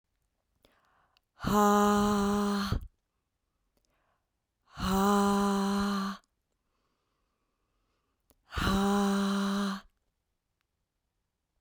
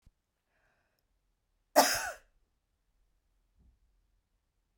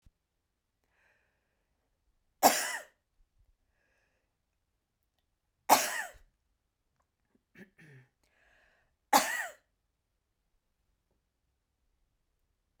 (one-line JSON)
{"exhalation_length": "11.6 s", "exhalation_amplitude": 6835, "exhalation_signal_mean_std_ratio": 0.51, "cough_length": "4.8 s", "cough_amplitude": 11657, "cough_signal_mean_std_ratio": 0.18, "three_cough_length": "12.8 s", "three_cough_amplitude": 14271, "three_cough_signal_mean_std_ratio": 0.18, "survey_phase": "beta (2021-08-13 to 2022-03-07)", "age": "45-64", "gender": "Female", "wearing_mask": "No", "symptom_cough_any": true, "symptom_runny_or_blocked_nose": true, "symptom_other": true, "symptom_onset": "2 days", "smoker_status": "Ex-smoker", "respiratory_condition_asthma": false, "respiratory_condition_other": false, "recruitment_source": "Test and Trace", "submission_delay": "1 day", "covid_test_result": "Negative", "covid_test_method": "RT-qPCR"}